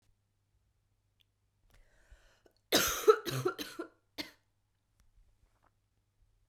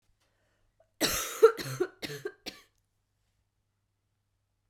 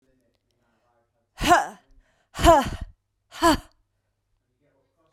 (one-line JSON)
{"three_cough_length": "6.5 s", "three_cough_amplitude": 10768, "three_cough_signal_mean_std_ratio": 0.23, "cough_length": "4.7 s", "cough_amplitude": 14114, "cough_signal_mean_std_ratio": 0.24, "exhalation_length": "5.1 s", "exhalation_amplitude": 21268, "exhalation_signal_mean_std_ratio": 0.29, "survey_phase": "beta (2021-08-13 to 2022-03-07)", "age": "18-44", "gender": "Female", "wearing_mask": "No", "symptom_cough_any": true, "symptom_runny_or_blocked_nose": true, "symptom_fatigue": true, "symptom_fever_high_temperature": true, "symptom_change_to_sense_of_smell_or_taste": true, "symptom_onset": "5 days", "smoker_status": "Never smoked", "respiratory_condition_asthma": false, "respiratory_condition_other": false, "recruitment_source": "Test and Trace", "submission_delay": "2 days", "covid_test_result": "Positive", "covid_test_method": "RT-qPCR", "covid_ct_value": 25.9, "covid_ct_gene": "ORF1ab gene", "covid_ct_mean": 26.7, "covid_viral_load": "1800 copies/ml", "covid_viral_load_category": "Minimal viral load (< 10K copies/ml)"}